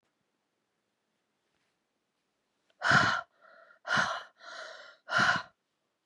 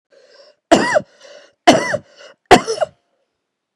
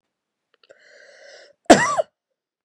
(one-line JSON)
{"exhalation_length": "6.1 s", "exhalation_amplitude": 9389, "exhalation_signal_mean_std_ratio": 0.34, "three_cough_length": "3.8 s", "three_cough_amplitude": 32768, "three_cough_signal_mean_std_ratio": 0.33, "cough_length": "2.6 s", "cough_amplitude": 32768, "cough_signal_mean_std_ratio": 0.23, "survey_phase": "beta (2021-08-13 to 2022-03-07)", "age": "18-44", "gender": "Female", "wearing_mask": "No", "symptom_cough_any": true, "symptom_sore_throat": true, "symptom_onset": "2 days", "smoker_status": "Never smoked", "respiratory_condition_asthma": false, "respiratory_condition_other": false, "recruitment_source": "Test and Trace", "submission_delay": "2 days", "covid_test_result": "Positive", "covid_test_method": "RT-qPCR", "covid_ct_value": 22.7, "covid_ct_gene": "N gene"}